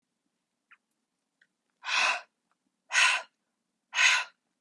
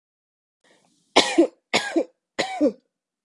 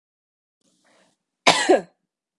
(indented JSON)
{
  "exhalation_length": "4.6 s",
  "exhalation_amplitude": 10383,
  "exhalation_signal_mean_std_ratio": 0.35,
  "three_cough_length": "3.2 s",
  "three_cough_amplitude": 32593,
  "three_cough_signal_mean_std_ratio": 0.36,
  "cough_length": "2.4 s",
  "cough_amplitude": 32768,
  "cough_signal_mean_std_ratio": 0.26,
  "survey_phase": "beta (2021-08-13 to 2022-03-07)",
  "age": "18-44",
  "gender": "Female",
  "wearing_mask": "No",
  "symptom_runny_or_blocked_nose": true,
  "symptom_shortness_of_breath": true,
  "symptom_sore_throat": true,
  "symptom_onset": "5 days",
  "smoker_status": "Never smoked",
  "respiratory_condition_asthma": false,
  "respiratory_condition_other": true,
  "recruitment_source": "REACT",
  "submission_delay": "0 days",
  "covid_test_result": "Negative",
  "covid_test_method": "RT-qPCR"
}